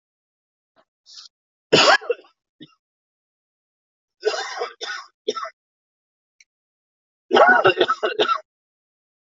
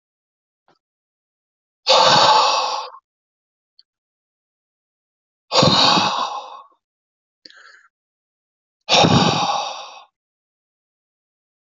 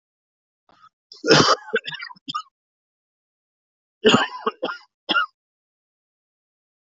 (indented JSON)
{
  "three_cough_length": "9.3 s",
  "three_cough_amplitude": 29989,
  "three_cough_signal_mean_std_ratio": 0.31,
  "exhalation_length": "11.6 s",
  "exhalation_amplitude": 27868,
  "exhalation_signal_mean_std_ratio": 0.38,
  "cough_length": "6.9 s",
  "cough_amplitude": 26722,
  "cough_signal_mean_std_ratio": 0.3,
  "survey_phase": "alpha (2021-03-01 to 2021-08-12)",
  "age": "45-64",
  "gender": "Male",
  "wearing_mask": "No",
  "symptom_cough_any": true,
  "symptom_onset": "6 days",
  "smoker_status": "Ex-smoker",
  "respiratory_condition_asthma": false,
  "respiratory_condition_other": false,
  "recruitment_source": "Test and Trace",
  "submission_delay": "2 days",
  "covid_test_result": "Positive",
  "covid_test_method": "RT-qPCR",
  "covid_ct_value": 31.2,
  "covid_ct_gene": "ORF1ab gene"
}